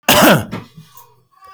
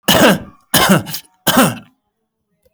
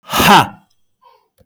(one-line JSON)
{"cough_length": "1.5 s", "cough_amplitude": 32768, "cough_signal_mean_std_ratio": 0.45, "three_cough_length": "2.7 s", "three_cough_amplitude": 32768, "three_cough_signal_mean_std_ratio": 0.5, "exhalation_length": "1.5 s", "exhalation_amplitude": 32768, "exhalation_signal_mean_std_ratio": 0.41, "survey_phase": "beta (2021-08-13 to 2022-03-07)", "age": "45-64", "gender": "Male", "wearing_mask": "No", "symptom_none": true, "smoker_status": "Ex-smoker", "respiratory_condition_asthma": false, "respiratory_condition_other": false, "recruitment_source": "REACT", "submission_delay": "1 day", "covid_test_result": "Negative", "covid_test_method": "RT-qPCR", "influenza_a_test_result": "Negative", "influenza_b_test_result": "Negative"}